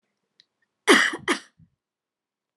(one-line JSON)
{"cough_length": "2.6 s", "cough_amplitude": 25991, "cough_signal_mean_std_ratio": 0.27, "survey_phase": "alpha (2021-03-01 to 2021-08-12)", "age": "45-64", "gender": "Female", "wearing_mask": "No", "symptom_none": true, "smoker_status": "Never smoked", "respiratory_condition_asthma": false, "respiratory_condition_other": false, "recruitment_source": "REACT", "submission_delay": "1 day", "covid_test_result": "Negative", "covid_test_method": "RT-qPCR"}